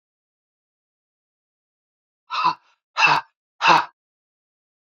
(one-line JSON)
{"exhalation_length": "4.9 s", "exhalation_amplitude": 26851, "exhalation_signal_mean_std_ratio": 0.28, "survey_phase": "alpha (2021-03-01 to 2021-08-12)", "age": "45-64", "gender": "Female", "wearing_mask": "No", "symptom_cough_any": true, "symptom_fatigue": true, "smoker_status": "Ex-smoker", "respiratory_condition_asthma": false, "respiratory_condition_other": false, "recruitment_source": "Test and Trace", "submission_delay": "2 days", "covid_test_result": "Positive", "covid_test_method": "RT-qPCR", "covid_ct_value": 16.4, "covid_ct_gene": "ORF1ab gene", "covid_ct_mean": 18.0, "covid_viral_load": "1200000 copies/ml", "covid_viral_load_category": "High viral load (>1M copies/ml)"}